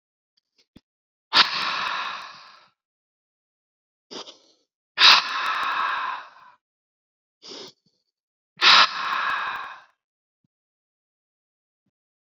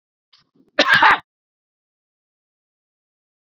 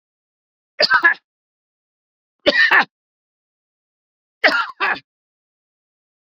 {"exhalation_length": "12.2 s", "exhalation_amplitude": 31497, "exhalation_signal_mean_std_ratio": 0.33, "cough_length": "3.4 s", "cough_amplitude": 32439, "cough_signal_mean_std_ratio": 0.25, "three_cough_length": "6.3 s", "three_cough_amplitude": 29743, "three_cough_signal_mean_std_ratio": 0.31, "survey_phase": "beta (2021-08-13 to 2022-03-07)", "age": "45-64", "gender": "Male", "wearing_mask": "No", "symptom_diarrhoea": true, "smoker_status": "Never smoked", "respiratory_condition_asthma": false, "respiratory_condition_other": false, "recruitment_source": "REACT", "submission_delay": "2 days", "covid_test_result": "Negative", "covid_test_method": "RT-qPCR"}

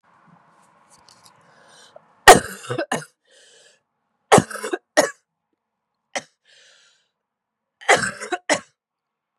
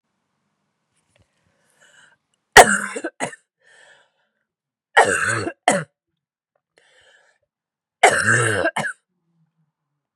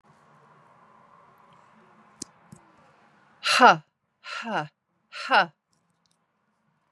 {"cough_length": "9.4 s", "cough_amplitude": 32768, "cough_signal_mean_std_ratio": 0.22, "three_cough_length": "10.2 s", "three_cough_amplitude": 32768, "three_cough_signal_mean_std_ratio": 0.28, "exhalation_length": "6.9 s", "exhalation_amplitude": 28298, "exhalation_signal_mean_std_ratio": 0.23, "survey_phase": "beta (2021-08-13 to 2022-03-07)", "age": "45-64", "gender": "Female", "wearing_mask": "No", "symptom_cough_any": true, "symptom_runny_or_blocked_nose": true, "symptom_sore_throat": true, "symptom_abdominal_pain": true, "symptom_fatigue": true, "symptom_fever_high_temperature": true, "symptom_headache": true, "smoker_status": "Never smoked", "respiratory_condition_asthma": false, "respiratory_condition_other": false, "recruitment_source": "Test and Trace", "submission_delay": "1 day", "covid_test_result": "Positive", "covid_test_method": "RT-qPCR", "covid_ct_value": 33.6, "covid_ct_gene": "N gene"}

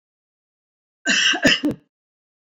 {"cough_length": "2.6 s", "cough_amplitude": 24351, "cough_signal_mean_std_ratio": 0.39, "survey_phase": "beta (2021-08-13 to 2022-03-07)", "age": "65+", "gender": "Female", "wearing_mask": "No", "symptom_runny_or_blocked_nose": true, "smoker_status": "Never smoked", "respiratory_condition_asthma": false, "respiratory_condition_other": false, "recruitment_source": "REACT", "submission_delay": "2 days", "covid_test_result": "Negative", "covid_test_method": "RT-qPCR", "influenza_a_test_result": "Negative", "influenza_b_test_result": "Negative"}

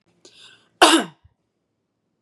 {"cough_length": "2.2 s", "cough_amplitude": 32768, "cough_signal_mean_std_ratio": 0.25, "survey_phase": "beta (2021-08-13 to 2022-03-07)", "age": "18-44", "gender": "Female", "wearing_mask": "No", "symptom_none": true, "smoker_status": "Never smoked", "respiratory_condition_asthma": false, "respiratory_condition_other": false, "recruitment_source": "REACT", "submission_delay": "3 days", "covid_test_result": "Negative", "covid_test_method": "RT-qPCR", "influenza_a_test_result": "Negative", "influenza_b_test_result": "Negative"}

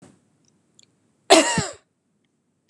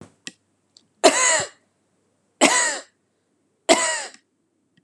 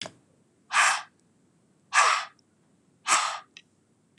{"cough_length": "2.7 s", "cough_amplitude": 32768, "cough_signal_mean_std_ratio": 0.25, "three_cough_length": "4.8 s", "three_cough_amplitude": 32188, "three_cough_signal_mean_std_ratio": 0.36, "exhalation_length": "4.2 s", "exhalation_amplitude": 15744, "exhalation_signal_mean_std_ratio": 0.37, "survey_phase": "beta (2021-08-13 to 2022-03-07)", "age": "45-64", "gender": "Female", "wearing_mask": "No", "symptom_sore_throat": true, "smoker_status": "Never smoked", "respiratory_condition_asthma": false, "respiratory_condition_other": false, "recruitment_source": "REACT", "submission_delay": "2 days", "covid_test_result": "Negative", "covid_test_method": "RT-qPCR", "influenza_a_test_result": "Negative", "influenza_b_test_result": "Negative"}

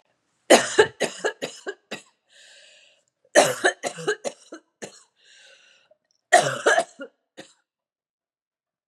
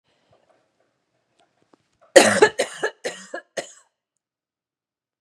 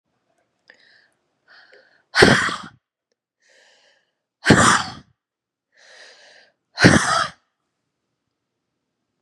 {"three_cough_length": "8.9 s", "three_cough_amplitude": 32768, "three_cough_signal_mean_std_ratio": 0.3, "cough_length": "5.2 s", "cough_amplitude": 32768, "cough_signal_mean_std_ratio": 0.22, "exhalation_length": "9.2 s", "exhalation_amplitude": 32768, "exhalation_signal_mean_std_ratio": 0.28, "survey_phase": "beta (2021-08-13 to 2022-03-07)", "age": "45-64", "gender": "Female", "wearing_mask": "No", "symptom_cough_any": true, "symptom_runny_or_blocked_nose": true, "symptom_sore_throat": true, "symptom_fatigue": true, "symptom_other": true, "symptom_onset": "2 days", "smoker_status": "Ex-smoker", "respiratory_condition_asthma": false, "respiratory_condition_other": false, "recruitment_source": "Test and Trace", "submission_delay": "1 day", "covid_test_result": "Negative", "covid_test_method": "RT-qPCR"}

